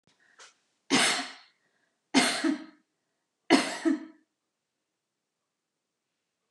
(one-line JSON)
{"three_cough_length": "6.5 s", "three_cough_amplitude": 13590, "three_cough_signal_mean_std_ratio": 0.33, "survey_phase": "beta (2021-08-13 to 2022-03-07)", "age": "65+", "gender": "Female", "wearing_mask": "No", "symptom_none": true, "smoker_status": "Ex-smoker", "respiratory_condition_asthma": false, "respiratory_condition_other": false, "recruitment_source": "REACT", "submission_delay": "1 day", "covid_test_result": "Negative", "covid_test_method": "RT-qPCR", "influenza_a_test_result": "Negative", "influenza_b_test_result": "Negative"}